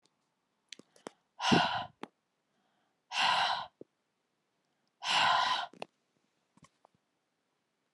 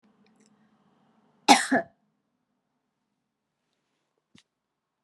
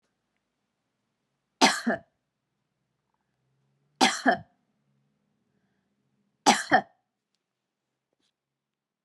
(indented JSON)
{
  "exhalation_length": "7.9 s",
  "exhalation_amplitude": 6921,
  "exhalation_signal_mean_std_ratio": 0.36,
  "cough_length": "5.0 s",
  "cough_amplitude": 28400,
  "cough_signal_mean_std_ratio": 0.16,
  "three_cough_length": "9.0 s",
  "three_cough_amplitude": 20545,
  "three_cough_signal_mean_std_ratio": 0.22,
  "survey_phase": "beta (2021-08-13 to 2022-03-07)",
  "age": "45-64",
  "gender": "Female",
  "wearing_mask": "No",
  "symptom_none": true,
  "smoker_status": "Ex-smoker",
  "respiratory_condition_asthma": false,
  "respiratory_condition_other": false,
  "recruitment_source": "REACT",
  "submission_delay": "1 day",
  "covid_test_result": "Negative",
  "covid_test_method": "RT-qPCR"
}